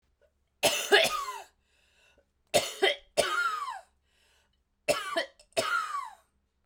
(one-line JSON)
{"three_cough_length": "6.7 s", "three_cough_amplitude": 15896, "three_cough_signal_mean_std_ratio": 0.45, "survey_phase": "beta (2021-08-13 to 2022-03-07)", "age": "45-64", "gender": "Female", "wearing_mask": "No", "symptom_new_continuous_cough": true, "symptom_runny_or_blocked_nose": true, "symptom_sore_throat": true, "symptom_fatigue": true, "symptom_fever_high_temperature": true, "symptom_headache": true, "symptom_change_to_sense_of_smell_or_taste": true, "symptom_loss_of_taste": true, "symptom_onset": "5 days", "smoker_status": "Ex-smoker", "respiratory_condition_asthma": false, "respiratory_condition_other": false, "recruitment_source": "Test and Trace", "submission_delay": "1 day", "covid_test_result": "Positive", "covid_test_method": "RT-qPCR", "covid_ct_value": 14.1, "covid_ct_gene": "ORF1ab gene", "covid_ct_mean": 14.5, "covid_viral_load": "18000000 copies/ml", "covid_viral_load_category": "High viral load (>1M copies/ml)"}